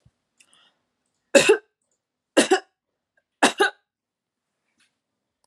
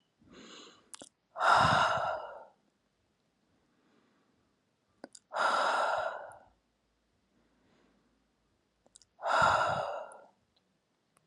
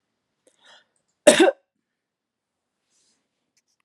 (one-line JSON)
{"three_cough_length": "5.5 s", "three_cough_amplitude": 29980, "three_cough_signal_mean_std_ratio": 0.24, "exhalation_length": "11.3 s", "exhalation_amplitude": 7338, "exhalation_signal_mean_std_ratio": 0.39, "cough_length": "3.8 s", "cough_amplitude": 32658, "cough_signal_mean_std_ratio": 0.19, "survey_phase": "beta (2021-08-13 to 2022-03-07)", "age": "18-44", "gender": "Female", "wearing_mask": "No", "symptom_none": true, "smoker_status": "Never smoked", "respiratory_condition_asthma": false, "respiratory_condition_other": false, "recruitment_source": "REACT", "submission_delay": "1 day", "covid_test_result": "Negative", "covid_test_method": "RT-qPCR", "influenza_a_test_result": "Unknown/Void", "influenza_b_test_result": "Unknown/Void"}